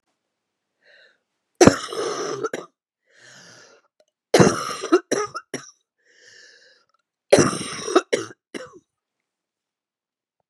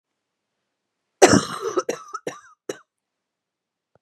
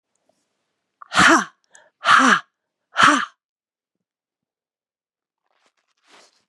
three_cough_length: 10.5 s
three_cough_amplitude: 32768
three_cough_signal_mean_std_ratio: 0.29
cough_length: 4.0 s
cough_amplitude: 32767
cough_signal_mean_std_ratio: 0.24
exhalation_length: 6.5 s
exhalation_amplitude: 31687
exhalation_signal_mean_std_ratio: 0.3
survey_phase: beta (2021-08-13 to 2022-03-07)
age: 45-64
gender: Female
wearing_mask: 'No'
symptom_cough_any: true
symptom_runny_or_blocked_nose: true
symptom_sore_throat: true
symptom_fatigue: true
symptom_fever_high_temperature: true
symptom_headache: true
symptom_other: true
symptom_onset: 6 days
smoker_status: Never smoked
respiratory_condition_asthma: true
respiratory_condition_other: true
recruitment_source: Test and Trace
submission_delay: 1 day
covid_test_result: Positive
covid_test_method: ePCR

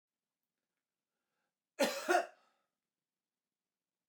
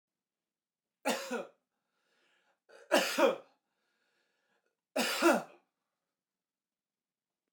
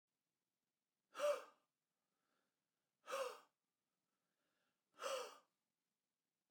cough_length: 4.1 s
cough_amplitude: 4408
cough_signal_mean_std_ratio: 0.23
three_cough_length: 7.5 s
three_cough_amplitude: 7817
three_cough_signal_mean_std_ratio: 0.29
exhalation_length: 6.5 s
exhalation_amplitude: 1004
exhalation_signal_mean_std_ratio: 0.27
survey_phase: beta (2021-08-13 to 2022-03-07)
age: 45-64
gender: Male
wearing_mask: 'No'
symptom_none: true
smoker_status: Never smoked
respiratory_condition_asthma: false
respiratory_condition_other: false
recruitment_source: REACT
submission_delay: 1 day
covid_test_result: Negative
covid_test_method: RT-qPCR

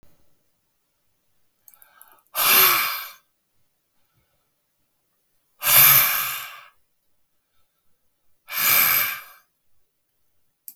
exhalation_length: 10.8 s
exhalation_amplitude: 32518
exhalation_signal_mean_std_ratio: 0.34
survey_phase: beta (2021-08-13 to 2022-03-07)
age: 65+
gender: Male
wearing_mask: 'No'
symptom_none: true
smoker_status: Never smoked
respiratory_condition_asthma: true
respiratory_condition_other: false
recruitment_source: REACT
submission_delay: 2 days
covid_test_result: Negative
covid_test_method: RT-qPCR
influenza_a_test_result: Negative
influenza_b_test_result: Negative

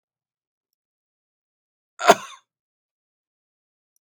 cough_length: 4.2 s
cough_amplitude: 32767
cough_signal_mean_std_ratio: 0.12
survey_phase: beta (2021-08-13 to 2022-03-07)
age: 65+
gender: Male
wearing_mask: 'No'
symptom_none: true
smoker_status: Ex-smoker
respiratory_condition_asthma: false
respiratory_condition_other: false
recruitment_source: REACT
submission_delay: 1 day
covid_test_result: Negative
covid_test_method: RT-qPCR
influenza_a_test_result: Negative
influenza_b_test_result: Negative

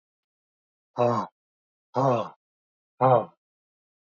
exhalation_length: 4.1 s
exhalation_amplitude: 13822
exhalation_signal_mean_std_ratio: 0.34
survey_phase: beta (2021-08-13 to 2022-03-07)
age: 45-64
gender: Male
wearing_mask: 'No'
symptom_none: true
smoker_status: Never smoked
respiratory_condition_asthma: false
respiratory_condition_other: false
recruitment_source: REACT
submission_delay: 2 days
covid_test_result: Negative
covid_test_method: RT-qPCR
influenza_a_test_result: Unknown/Void
influenza_b_test_result: Unknown/Void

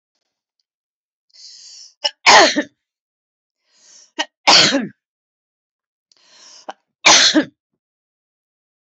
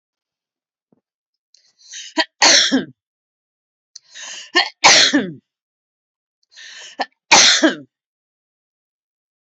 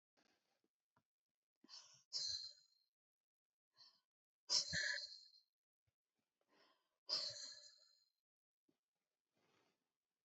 cough_length: 9.0 s
cough_amplitude: 32768
cough_signal_mean_std_ratio: 0.29
three_cough_length: 9.6 s
three_cough_amplitude: 32768
three_cough_signal_mean_std_ratio: 0.32
exhalation_length: 10.2 s
exhalation_amplitude: 1907
exhalation_signal_mean_std_ratio: 0.29
survey_phase: alpha (2021-03-01 to 2021-08-12)
age: 65+
gender: Female
wearing_mask: 'No'
symptom_none: true
smoker_status: Never smoked
respiratory_condition_asthma: true
respiratory_condition_other: false
recruitment_source: REACT
submission_delay: 2 days
covid_test_result: Negative
covid_test_method: RT-qPCR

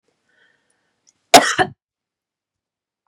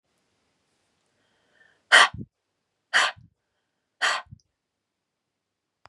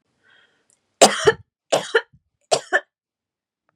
cough_length: 3.1 s
cough_amplitude: 32768
cough_signal_mean_std_ratio: 0.2
exhalation_length: 5.9 s
exhalation_amplitude: 29617
exhalation_signal_mean_std_ratio: 0.21
three_cough_length: 3.8 s
three_cough_amplitude: 32768
three_cough_signal_mean_std_ratio: 0.27
survey_phase: beta (2021-08-13 to 2022-03-07)
age: 18-44
gender: Female
wearing_mask: 'No'
symptom_cough_any: true
symptom_runny_or_blocked_nose: true
smoker_status: Never smoked
respiratory_condition_asthma: false
respiratory_condition_other: false
recruitment_source: REACT
submission_delay: 0 days
covid_test_result: Negative
covid_test_method: RT-qPCR
influenza_a_test_result: Negative
influenza_b_test_result: Negative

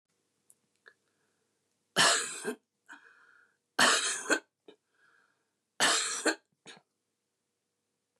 three_cough_length: 8.2 s
three_cough_amplitude: 10458
three_cough_signal_mean_std_ratio: 0.33
survey_phase: beta (2021-08-13 to 2022-03-07)
age: 65+
gender: Female
wearing_mask: 'No'
symptom_cough_any: true
symptom_headache: true
smoker_status: Never smoked
respiratory_condition_asthma: false
respiratory_condition_other: false
recruitment_source: REACT
submission_delay: 2 days
covid_test_result: Negative
covid_test_method: RT-qPCR
influenza_a_test_result: Negative
influenza_b_test_result: Negative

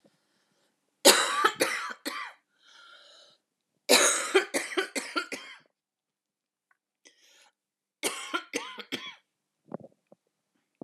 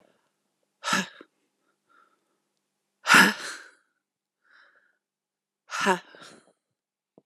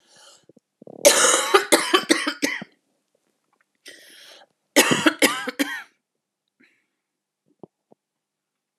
three_cough_length: 10.8 s
three_cough_amplitude: 22401
three_cough_signal_mean_std_ratio: 0.32
exhalation_length: 7.3 s
exhalation_amplitude: 23291
exhalation_signal_mean_std_ratio: 0.23
cough_length: 8.8 s
cough_amplitude: 30550
cough_signal_mean_std_ratio: 0.34
survey_phase: alpha (2021-03-01 to 2021-08-12)
age: 18-44
gender: Female
wearing_mask: 'No'
symptom_cough_any: true
symptom_new_continuous_cough: true
symptom_headache: true
symptom_onset: 3 days
smoker_status: Ex-smoker
respiratory_condition_asthma: false
respiratory_condition_other: false
recruitment_source: Test and Trace
submission_delay: 0 days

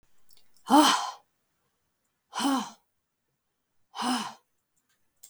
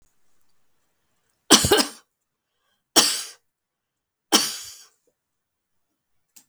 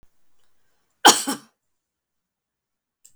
exhalation_length: 5.3 s
exhalation_amplitude: 15769
exhalation_signal_mean_std_ratio: 0.32
three_cough_length: 6.5 s
three_cough_amplitude: 32768
three_cough_signal_mean_std_ratio: 0.25
cough_length: 3.2 s
cough_amplitude: 32766
cough_signal_mean_std_ratio: 0.18
survey_phase: beta (2021-08-13 to 2022-03-07)
age: 45-64
gender: Female
wearing_mask: 'No'
symptom_sore_throat: true
smoker_status: Never smoked
respiratory_condition_asthma: false
respiratory_condition_other: false
recruitment_source: Test and Trace
submission_delay: 1 day
covid_test_result: Negative
covid_test_method: RT-qPCR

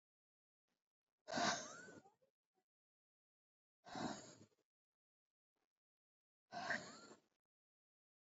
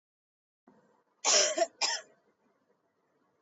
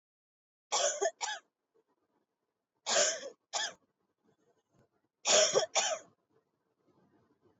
exhalation_length: 8.4 s
exhalation_amplitude: 1545
exhalation_signal_mean_std_ratio: 0.29
cough_length: 3.4 s
cough_amplitude: 9191
cough_signal_mean_std_ratio: 0.32
three_cough_length: 7.6 s
three_cough_amplitude: 7307
three_cough_signal_mean_std_ratio: 0.36
survey_phase: beta (2021-08-13 to 2022-03-07)
age: 18-44
gender: Female
wearing_mask: 'No'
symptom_cough_any: true
symptom_new_continuous_cough: true
symptom_runny_or_blocked_nose: true
symptom_sore_throat: true
symptom_abdominal_pain: true
symptom_diarrhoea: true
symptom_fatigue: true
symptom_fever_high_temperature: true
symptom_headache: true
symptom_change_to_sense_of_smell_or_taste: true
symptom_loss_of_taste: true
symptom_onset: 3 days
smoker_status: Ex-smoker
respiratory_condition_asthma: false
respiratory_condition_other: false
recruitment_source: Test and Trace
submission_delay: 3 days
covid_test_result: Positive
covid_test_method: RT-qPCR
covid_ct_value: 20.6
covid_ct_gene: ORF1ab gene
covid_ct_mean: 21.3
covid_viral_load: 100000 copies/ml
covid_viral_load_category: Low viral load (10K-1M copies/ml)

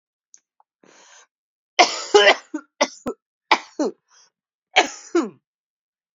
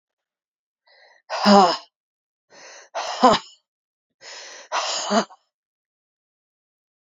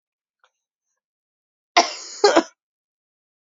three_cough_length: 6.1 s
three_cough_amplitude: 32767
three_cough_signal_mean_std_ratio: 0.29
exhalation_length: 7.2 s
exhalation_amplitude: 29414
exhalation_signal_mean_std_ratio: 0.3
cough_length: 3.6 s
cough_amplitude: 32731
cough_signal_mean_std_ratio: 0.23
survey_phase: beta (2021-08-13 to 2022-03-07)
age: 45-64
gender: Female
wearing_mask: 'No'
symptom_cough_any: true
symptom_new_continuous_cough: true
symptom_shortness_of_breath: true
symptom_sore_throat: true
symptom_abdominal_pain: true
symptom_fatigue: true
symptom_fever_high_temperature: true
symptom_headache: true
symptom_onset: 2 days
smoker_status: Never smoked
respiratory_condition_asthma: false
respiratory_condition_other: false
recruitment_source: Test and Trace
submission_delay: 1 day
covid_test_result: Positive
covid_test_method: RT-qPCR
covid_ct_value: 22.6
covid_ct_gene: ORF1ab gene
covid_ct_mean: 23.4
covid_viral_load: 21000 copies/ml
covid_viral_load_category: Low viral load (10K-1M copies/ml)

